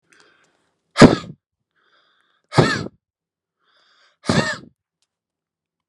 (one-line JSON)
{"exhalation_length": "5.9 s", "exhalation_amplitude": 32768, "exhalation_signal_mean_std_ratio": 0.22, "survey_phase": "beta (2021-08-13 to 2022-03-07)", "age": "65+", "gender": "Male", "wearing_mask": "No", "symptom_none": true, "smoker_status": "Ex-smoker", "respiratory_condition_asthma": false, "respiratory_condition_other": false, "recruitment_source": "REACT", "submission_delay": "6 days", "covid_test_result": "Negative", "covid_test_method": "RT-qPCR"}